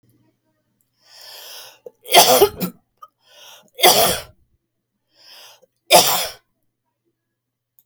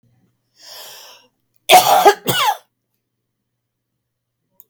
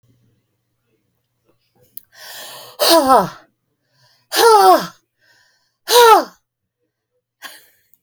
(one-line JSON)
{"three_cough_length": "7.9 s", "three_cough_amplitude": 32768, "three_cough_signal_mean_std_ratio": 0.3, "cough_length": "4.7 s", "cough_amplitude": 32768, "cough_signal_mean_std_ratio": 0.3, "exhalation_length": "8.0 s", "exhalation_amplitude": 32768, "exhalation_signal_mean_std_ratio": 0.34, "survey_phase": "beta (2021-08-13 to 2022-03-07)", "age": "65+", "gender": "Female", "wearing_mask": "No", "symptom_cough_any": true, "symptom_runny_or_blocked_nose": true, "symptom_abdominal_pain": true, "symptom_fatigue": true, "symptom_headache": true, "smoker_status": "Ex-smoker", "respiratory_condition_asthma": true, "respiratory_condition_other": false, "recruitment_source": "REACT", "submission_delay": "5 days", "covid_test_result": "Negative", "covid_test_method": "RT-qPCR", "influenza_a_test_result": "Negative", "influenza_b_test_result": "Negative"}